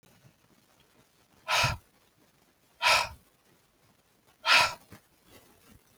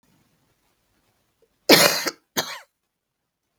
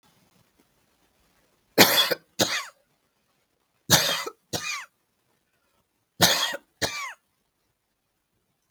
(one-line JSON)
{"exhalation_length": "6.0 s", "exhalation_amplitude": 11561, "exhalation_signal_mean_std_ratio": 0.3, "cough_length": "3.6 s", "cough_amplitude": 32768, "cough_signal_mean_std_ratio": 0.25, "three_cough_length": "8.7 s", "three_cough_amplitude": 32768, "three_cough_signal_mean_std_ratio": 0.31, "survey_phase": "beta (2021-08-13 to 2022-03-07)", "age": "45-64", "gender": "Female", "wearing_mask": "No", "symptom_none": true, "smoker_status": "Ex-smoker", "respiratory_condition_asthma": false, "respiratory_condition_other": false, "recruitment_source": "REACT", "submission_delay": "2 days", "covid_test_result": "Negative", "covid_test_method": "RT-qPCR", "influenza_a_test_result": "Negative", "influenza_b_test_result": "Negative"}